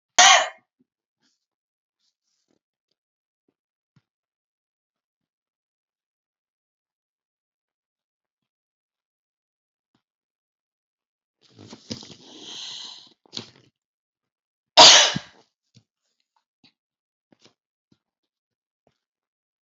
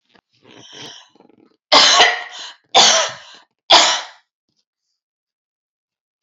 {"cough_length": "19.6 s", "cough_amplitude": 32768, "cough_signal_mean_std_ratio": 0.15, "three_cough_length": "6.2 s", "three_cough_amplitude": 32767, "three_cough_signal_mean_std_ratio": 0.36, "survey_phase": "beta (2021-08-13 to 2022-03-07)", "age": "65+", "gender": "Female", "wearing_mask": "No", "symptom_none": true, "smoker_status": "Ex-smoker", "respiratory_condition_asthma": false, "respiratory_condition_other": false, "recruitment_source": "REACT", "submission_delay": "1 day", "covid_test_result": "Negative", "covid_test_method": "RT-qPCR", "influenza_a_test_result": "Negative", "influenza_b_test_result": "Negative"}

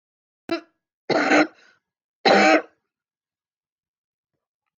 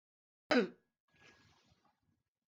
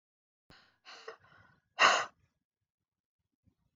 {"three_cough_length": "4.8 s", "three_cough_amplitude": 22781, "three_cough_signal_mean_std_ratio": 0.32, "cough_length": "2.5 s", "cough_amplitude": 4403, "cough_signal_mean_std_ratio": 0.21, "exhalation_length": "3.8 s", "exhalation_amplitude": 11116, "exhalation_signal_mean_std_ratio": 0.21, "survey_phase": "beta (2021-08-13 to 2022-03-07)", "age": "65+", "gender": "Female", "wearing_mask": "No", "symptom_cough_any": true, "symptom_shortness_of_breath": true, "symptom_sore_throat": true, "symptom_onset": "12 days", "smoker_status": "Never smoked", "respiratory_condition_asthma": false, "respiratory_condition_other": false, "recruitment_source": "REACT", "submission_delay": "1 day", "covid_test_result": "Negative", "covid_test_method": "RT-qPCR", "influenza_a_test_result": "Negative", "influenza_b_test_result": "Negative"}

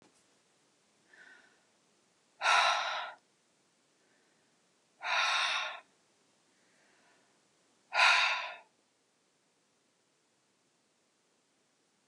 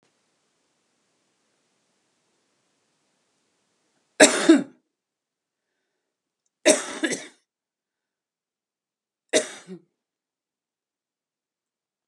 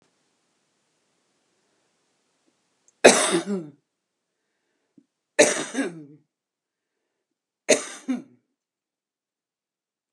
{"exhalation_length": "12.1 s", "exhalation_amplitude": 8127, "exhalation_signal_mean_std_ratio": 0.31, "cough_length": "12.1 s", "cough_amplitude": 32530, "cough_signal_mean_std_ratio": 0.18, "three_cough_length": "10.1 s", "three_cough_amplitude": 32768, "three_cough_signal_mean_std_ratio": 0.22, "survey_phase": "beta (2021-08-13 to 2022-03-07)", "age": "65+", "gender": "Female", "wearing_mask": "No", "symptom_cough_any": true, "symptom_runny_or_blocked_nose": true, "symptom_loss_of_taste": true, "smoker_status": "Never smoked", "respiratory_condition_asthma": false, "respiratory_condition_other": false, "recruitment_source": "REACT", "submission_delay": "2 days", "covid_test_result": "Negative", "covid_test_method": "RT-qPCR"}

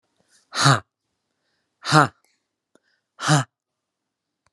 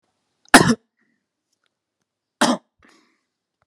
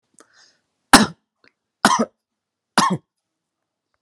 {"exhalation_length": "4.5 s", "exhalation_amplitude": 32557, "exhalation_signal_mean_std_ratio": 0.27, "cough_length": "3.7 s", "cough_amplitude": 32768, "cough_signal_mean_std_ratio": 0.21, "three_cough_length": "4.0 s", "three_cough_amplitude": 32768, "three_cough_signal_mean_std_ratio": 0.25, "survey_phase": "alpha (2021-03-01 to 2021-08-12)", "age": "45-64", "gender": "Male", "wearing_mask": "No", "symptom_none": true, "symptom_onset": "2 days", "smoker_status": "Ex-smoker", "respiratory_condition_asthma": false, "respiratory_condition_other": false, "recruitment_source": "REACT", "submission_delay": "1 day", "covid_test_result": "Negative", "covid_test_method": "RT-qPCR"}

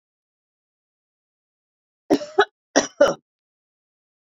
{"cough_length": "4.3 s", "cough_amplitude": 26603, "cough_signal_mean_std_ratio": 0.22, "survey_phase": "beta (2021-08-13 to 2022-03-07)", "age": "65+", "gender": "Female", "wearing_mask": "No", "symptom_none": true, "smoker_status": "Ex-smoker", "respiratory_condition_asthma": false, "respiratory_condition_other": false, "recruitment_source": "REACT", "submission_delay": "9 days", "covid_test_result": "Negative", "covid_test_method": "RT-qPCR"}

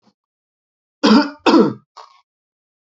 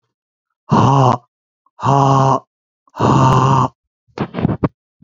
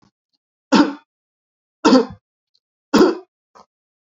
{"cough_length": "2.8 s", "cough_amplitude": 28481, "cough_signal_mean_std_ratio": 0.35, "exhalation_length": "5.0 s", "exhalation_amplitude": 32768, "exhalation_signal_mean_std_ratio": 0.55, "three_cough_length": "4.2 s", "three_cough_amplitude": 30248, "three_cough_signal_mean_std_ratio": 0.31, "survey_phase": "beta (2021-08-13 to 2022-03-07)", "age": "45-64", "gender": "Male", "wearing_mask": "No", "symptom_none": true, "smoker_status": "Never smoked", "respiratory_condition_asthma": false, "respiratory_condition_other": false, "recruitment_source": "REACT", "submission_delay": "3 days", "covid_test_result": "Negative", "covid_test_method": "RT-qPCR", "influenza_a_test_result": "Negative", "influenza_b_test_result": "Negative"}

